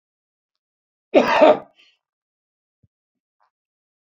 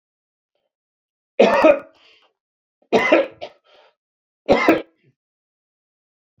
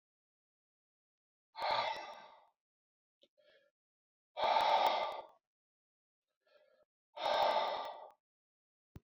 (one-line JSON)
{"cough_length": "4.1 s", "cough_amplitude": 28325, "cough_signal_mean_std_ratio": 0.24, "three_cough_length": "6.4 s", "three_cough_amplitude": 28562, "three_cough_signal_mean_std_ratio": 0.31, "exhalation_length": "9.0 s", "exhalation_amplitude": 3414, "exhalation_signal_mean_std_ratio": 0.38, "survey_phase": "beta (2021-08-13 to 2022-03-07)", "age": "65+", "gender": "Male", "wearing_mask": "No", "symptom_none": true, "smoker_status": "Never smoked", "respiratory_condition_asthma": false, "respiratory_condition_other": false, "recruitment_source": "REACT", "submission_delay": "2 days", "covid_test_result": "Negative", "covid_test_method": "RT-qPCR"}